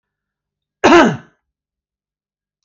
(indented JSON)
{
  "cough_length": "2.6 s",
  "cough_amplitude": 28500,
  "cough_signal_mean_std_ratio": 0.28,
  "survey_phase": "alpha (2021-03-01 to 2021-08-12)",
  "age": "45-64",
  "gender": "Male",
  "wearing_mask": "No",
  "symptom_none": true,
  "smoker_status": "Never smoked",
  "respiratory_condition_asthma": false,
  "respiratory_condition_other": false,
  "recruitment_source": "REACT",
  "submission_delay": "1 day",
  "covid_test_result": "Negative",
  "covid_test_method": "RT-qPCR"
}